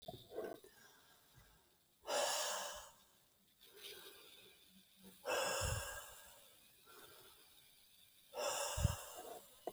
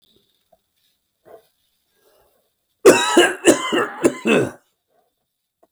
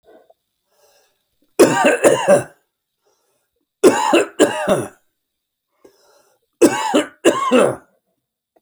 {"exhalation_length": "9.7 s", "exhalation_amplitude": 2632, "exhalation_signal_mean_std_ratio": 0.5, "cough_length": "5.7 s", "cough_amplitude": 29896, "cough_signal_mean_std_ratio": 0.34, "three_cough_length": "8.6 s", "three_cough_amplitude": 32768, "three_cough_signal_mean_std_ratio": 0.41, "survey_phase": "beta (2021-08-13 to 2022-03-07)", "age": "45-64", "gender": "Male", "wearing_mask": "No", "symptom_shortness_of_breath": true, "symptom_headache": true, "symptom_onset": "10 days", "smoker_status": "Current smoker (1 to 10 cigarettes per day)", "respiratory_condition_asthma": false, "respiratory_condition_other": false, "recruitment_source": "REACT", "submission_delay": "4 days", "covid_test_result": "Negative", "covid_test_method": "RT-qPCR"}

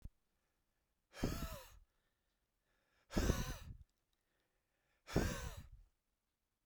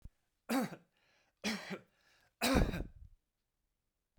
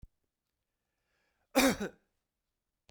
{"exhalation_length": "6.7 s", "exhalation_amplitude": 3107, "exhalation_signal_mean_std_ratio": 0.34, "three_cough_length": "4.2 s", "three_cough_amplitude": 4681, "three_cough_signal_mean_std_ratio": 0.36, "cough_length": "2.9 s", "cough_amplitude": 7351, "cough_signal_mean_std_ratio": 0.23, "survey_phase": "beta (2021-08-13 to 2022-03-07)", "age": "45-64", "gender": "Male", "wearing_mask": "No", "symptom_cough_any": true, "symptom_runny_or_blocked_nose": true, "symptom_sore_throat": true, "symptom_abdominal_pain": true, "symptom_fatigue": true, "symptom_headache": true, "smoker_status": "Never smoked", "respiratory_condition_asthma": false, "respiratory_condition_other": false, "recruitment_source": "Test and Trace", "submission_delay": "2 days", "covid_test_result": "Positive", "covid_test_method": "RT-qPCR", "covid_ct_value": 24.7, "covid_ct_gene": "ORF1ab gene", "covid_ct_mean": 25.5, "covid_viral_load": "4200 copies/ml", "covid_viral_load_category": "Minimal viral load (< 10K copies/ml)"}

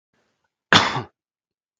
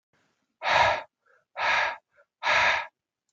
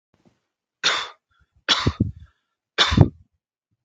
{"cough_length": "1.8 s", "cough_amplitude": 32768, "cough_signal_mean_std_ratio": 0.26, "exhalation_length": "3.3 s", "exhalation_amplitude": 11070, "exhalation_signal_mean_std_ratio": 0.49, "three_cough_length": "3.8 s", "three_cough_amplitude": 32768, "three_cough_signal_mean_std_ratio": 0.32, "survey_phase": "beta (2021-08-13 to 2022-03-07)", "age": "18-44", "gender": "Male", "wearing_mask": "No", "symptom_none": true, "smoker_status": "Never smoked", "respiratory_condition_asthma": false, "respiratory_condition_other": false, "recruitment_source": "REACT", "submission_delay": "0 days", "covid_test_result": "Negative", "covid_test_method": "RT-qPCR"}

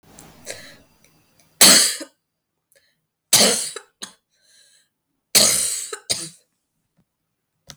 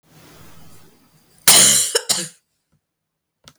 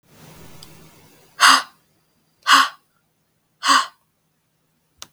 {"three_cough_length": "7.8 s", "three_cough_amplitude": 32768, "three_cough_signal_mean_std_ratio": 0.31, "cough_length": "3.6 s", "cough_amplitude": 32768, "cough_signal_mean_std_ratio": 0.34, "exhalation_length": "5.1 s", "exhalation_amplitude": 32768, "exhalation_signal_mean_std_ratio": 0.28, "survey_phase": "beta (2021-08-13 to 2022-03-07)", "age": "18-44", "gender": "Female", "wearing_mask": "No", "symptom_cough_any": true, "symptom_new_continuous_cough": true, "symptom_runny_or_blocked_nose": true, "symptom_sore_throat": true, "symptom_fatigue": true, "symptom_fever_high_temperature": true, "symptom_change_to_sense_of_smell_or_taste": true, "symptom_onset": "3 days", "smoker_status": "Never smoked", "respiratory_condition_asthma": false, "respiratory_condition_other": false, "recruitment_source": "Test and Trace", "submission_delay": "1 day", "covid_test_result": "Positive", "covid_test_method": "RT-qPCR", "covid_ct_value": 28.0, "covid_ct_gene": "N gene"}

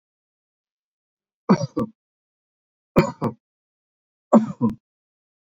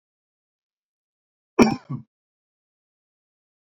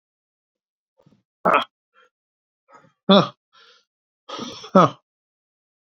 {"three_cough_length": "5.5 s", "three_cough_amplitude": 26788, "three_cough_signal_mean_std_ratio": 0.26, "cough_length": "3.8 s", "cough_amplitude": 26591, "cough_signal_mean_std_ratio": 0.16, "exhalation_length": "5.9 s", "exhalation_amplitude": 26768, "exhalation_signal_mean_std_ratio": 0.23, "survey_phase": "beta (2021-08-13 to 2022-03-07)", "age": "65+", "gender": "Male", "wearing_mask": "No", "symptom_none": true, "smoker_status": "Ex-smoker", "respiratory_condition_asthma": false, "respiratory_condition_other": false, "recruitment_source": "REACT", "submission_delay": "1 day", "covid_test_result": "Negative", "covid_test_method": "RT-qPCR", "influenza_a_test_result": "Unknown/Void", "influenza_b_test_result": "Unknown/Void"}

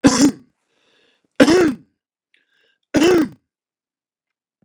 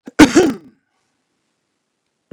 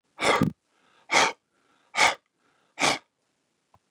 {"three_cough_length": "4.6 s", "three_cough_amplitude": 32768, "three_cough_signal_mean_std_ratio": 0.37, "cough_length": "2.3 s", "cough_amplitude": 32768, "cough_signal_mean_std_ratio": 0.27, "exhalation_length": "3.9 s", "exhalation_amplitude": 14217, "exhalation_signal_mean_std_ratio": 0.35, "survey_phase": "beta (2021-08-13 to 2022-03-07)", "age": "65+", "gender": "Male", "wearing_mask": "No", "symptom_cough_any": true, "symptom_runny_or_blocked_nose": true, "symptom_headache": true, "smoker_status": "Ex-smoker", "respiratory_condition_asthma": false, "respiratory_condition_other": false, "recruitment_source": "REACT", "submission_delay": "1 day", "covid_test_result": "Negative", "covid_test_method": "RT-qPCR", "influenza_a_test_result": "Negative", "influenza_b_test_result": "Negative"}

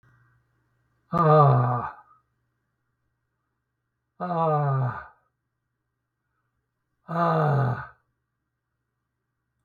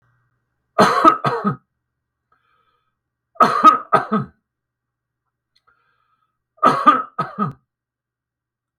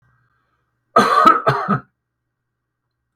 {"exhalation_length": "9.6 s", "exhalation_amplitude": 18460, "exhalation_signal_mean_std_ratio": 0.39, "three_cough_length": "8.8 s", "three_cough_amplitude": 32768, "three_cough_signal_mean_std_ratio": 0.33, "cough_length": "3.2 s", "cough_amplitude": 32768, "cough_signal_mean_std_ratio": 0.37, "survey_phase": "beta (2021-08-13 to 2022-03-07)", "age": "65+", "gender": "Male", "wearing_mask": "No", "symptom_none": true, "symptom_onset": "12 days", "smoker_status": "Ex-smoker", "respiratory_condition_asthma": false, "respiratory_condition_other": false, "recruitment_source": "REACT", "submission_delay": "4 days", "covid_test_result": "Negative", "covid_test_method": "RT-qPCR", "influenza_a_test_result": "Negative", "influenza_b_test_result": "Negative"}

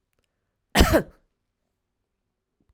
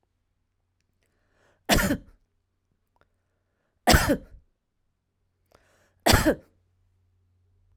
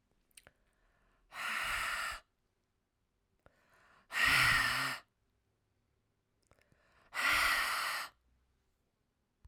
{"cough_length": "2.7 s", "cough_amplitude": 21103, "cough_signal_mean_std_ratio": 0.24, "three_cough_length": "7.8 s", "three_cough_amplitude": 21007, "three_cough_signal_mean_std_ratio": 0.25, "exhalation_length": "9.5 s", "exhalation_amplitude": 4416, "exhalation_signal_mean_std_ratio": 0.42, "survey_phase": "alpha (2021-03-01 to 2021-08-12)", "age": "45-64", "gender": "Female", "wearing_mask": "No", "symptom_headache": true, "smoker_status": "Ex-smoker", "respiratory_condition_asthma": false, "respiratory_condition_other": false, "recruitment_source": "Test and Trace", "submission_delay": "1 day", "covid_test_result": "Positive", "covid_test_method": "RT-qPCR", "covid_ct_value": 37.7, "covid_ct_gene": "N gene"}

